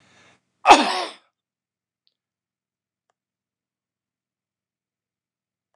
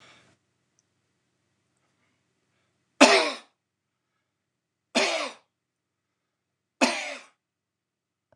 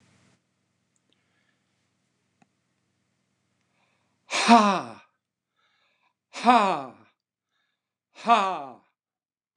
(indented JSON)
{
  "cough_length": "5.8 s",
  "cough_amplitude": 29204,
  "cough_signal_mean_std_ratio": 0.16,
  "three_cough_length": "8.4 s",
  "three_cough_amplitude": 29203,
  "three_cough_signal_mean_std_ratio": 0.22,
  "exhalation_length": "9.6 s",
  "exhalation_amplitude": 25995,
  "exhalation_signal_mean_std_ratio": 0.24,
  "survey_phase": "beta (2021-08-13 to 2022-03-07)",
  "age": "65+",
  "gender": "Male",
  "wearing_mask": "No",
  "symptom_cough_any": true,
  "symptom_runny_or_blocked_nose": true,
  "symptom_shortness_of_breath": true,
  "symptom_fatigue": true,
  "symptom_onset": "12 days",
  "smoker_status": "Never smoked",
  "respiratory_condition_asthma": false,
  "respiratory_condition_other": false,
  "recruitment_source": "REACT",
  "submission_delay": "1 day",
  "covid_test_result": "Negative",
  "covid_test_method": "RT-qPCR",
  "influenza_a_test_result": "Negative",
  "influenza_b_test_result": "Negative"
}